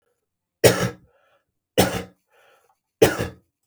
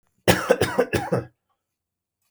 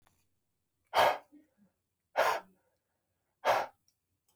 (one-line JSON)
{"three_cough_length": "3.7 s", "three_cough_amplitude": 32768, "three_cough_signal_mean_std_ratio": 0.3, "cough_length": "2.3 s", "cough_amplitude": 29393, "cough_signal_mean_std_ratio": 0.41, "exhalation_length": "4.4 s", "exhalation_amplitude": 7784, "exhalation_signal_mean_std_ratio": 0.31, "survey_phase": "beta (2021-08-13 to 2022-03-07)", "age": "45-64", "gender": "Male", "wearing_mask": "No", "symptom_none": true, "smoker_status": "Ex-smoker", "respiratory_condition_asthma": false, "respiratory_condition_other": false, "recruitment_source": "REACT", "submission_delay": "2 days", "covid_test_result": "Negative", "covid_test_method": "RT-qPCR", "influenza_a_test_result": "Negative", "influenza_b_test_result": "Negative"}